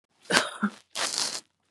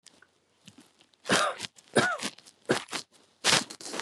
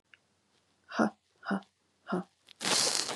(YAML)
cough_length: 1.7 s
cough_amplitude: 32767
cough_signal_mean_std_ratio: 0.46
three_cough_length: 4.0 s
three_cough_amplitude: 21681
three_cough_signal_mean_std_ratio: 0.4
exhalation_length: 3.2 s
exhalation_amplitude: 12736
exhalation_signal_mean_std_ratio: 0.42
survey_phase: beta (2021-08-13 to 2022-03-07)
age: 45-64
gender: Female
wearing_mask: 'No'
symptom_cough_any: true
symptom_runny_or_blocked_nose: true
symptom_fatigue: true
smoker_status: Ex-smoker
respiratory_condition_asthma: false
respiratory_condition_other: false
recruitment_source: REACT
submission_delay: 1 day
covid_test_result: Negative
covid_test_method: RT-qPCR
influenza_a_test_result: Negative
influenza_b_test_result: Negative